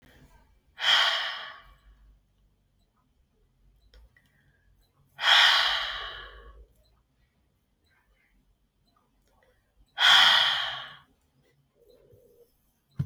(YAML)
exhalation_length: 13.1 s
exhalation_amplitude: 16387
exhalation_signal_mean_std_ratio: 0.32
survey_phase: alpha (2021-03-01 to 2021-08-12)
age: 18-44
gender: Female
wearing_mask: 'No'
symptom_cough_any: true
symptom_fatigue: true
symptom_fever_high_temperature: true
symptom_onset: 9 days
smoker_status: Never smoked
respiratory_condition_asthma: false
respiratory_condition_other: false
recruitment_source: Test and Trace
submission_delay: 2 days
covid_test_result: Positive
covid_test_method: RT-qPCR
covid_ct_value: 21.3
covid_ct_gene: ORF1ab gene